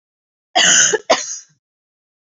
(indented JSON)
{
  "cough_length": "2.4 s",
  "cough_amplitude": 30885,
  "cough_signal_mean_std_ratio": 0.41,
  "survey_phase": "beta (2021-08-13 to 2022-03-07)",
  "age": "45-64",
  "gender": "Female",
  "wearing_mask": "No",
  "symptom_none": true,
  "smoker_status": "Never smoked",
  "respiratory_condition_asthma": false,
  "respiratory_condition_other": false,
  "recruitment_source": "REACT",
  "submission_delay": "1 day",
  "covid_test_result": "Negative",
  "covid_test_method": "RT-qPCR"
}